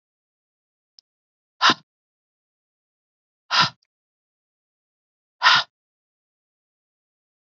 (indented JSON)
{
  "exhalation_length": "7.5 s",
  "exhalation_amplitude": 26903,
  "exhalation_signal_mean_std_ratio": 0.19,
  "survey_phase": "alpha (2021-03-01 to 2021-08-12)",
  "age": "45-64",
  "gender": "Female",
  "wearing_mask": "No",
  "symptom_none": true,
  "smoker_status": "Never smoked",
  "respiratory_condition_asthma": false,
  "respiratory_condition_other": false,
  "recruitment_source": "REACT",
  "submission_delay": "1 day",
  "covid_test_result": "Negative",
  "covid_test_method": "RT-qPCR"
}